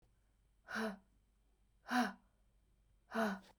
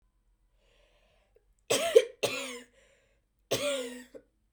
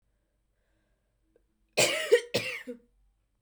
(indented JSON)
{
  "exhalation_length": "3.6 s",
  "exhalation_amplitude": 2643,
  "exhalation_signal_mean_std_ratio": 0.37,
  "three_cough_length": "4.5 s",
  "three_cough_amplitude": 15538,
  "three_cough_signal_mean_std_ratio": 0.31,
  "cough_length": "3.4 s",
  "cough_amplitude": 11066,
  "cough_signal_mean_std_ratio": 0.31,
  "survey_phase": "beta (2021-08-13 to 2022-03-07)",
  "age": "18-44",
  "gender": "Female",
  "wearing_mask": "No",
  "symptom_cough_any": true,
  "symptom_runny_or_blocked_nose": true,
  "symptom_shortness_of_breath": true,
  "symptom_diarrhoea": true,
  "symptom_fatigue": true,
  "symptom_fever_high_temperature": true,
  "symptom_headache": true,
  "symptom_change_to_sense_of_smell_or_taste": true,
  "symptom_loss_of_taste": true,
  "symptom_onset": "6 days",
  "smoker_status": "Ex-smoker",
  "respiratory_condition_asthma": false,
  "respiratory_condition_other": false,
  "recruitment_source": "Test and Trace",
  "submission_delay": "2 days",
  "covid_test_result": "Positive",
  "covid_test_method": "RT-qPCR",
  "covid_ct_value": 11.7,
  "covid_ct_gene": "ORF1ab gene",
  "covid_ct_mean": 12.1,
  "covid_viral_load": "110000000 copies/ml",
  "covid_viral_load_category": "High viral load (>1M copies/ml)"
}